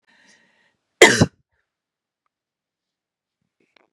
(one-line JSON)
{"cough_length": "3.9 s", "cough_amplitude": 32768, "cough_signal_mean_std_ratio": 0.17, "survey_phase": "beta (2021-08-13 to 2022-03-07)", "age": "45-64", "gender": "Female", "wearing_mask": "No", "symptom_cough_any": true, "symptom_runny_or_blocked_nose": true, "symptom_change_to_sense_of_smell_or_taste": true, "symptom_loss_of_taste": true, "symptom_onset": "9 days", "smoker_status": "Ex-smoker", "respiratory_condition_asthma": false, "respiratory_condition_other": false, "recruitment_source": "Test and Trace", "submission_delay": "2 days", "covid_test_result": "Positive", "covid_test_method": "RT-qPCR", "covid_ct_value": 18.8, "covid_ct_gene": "ORF1ab gene"}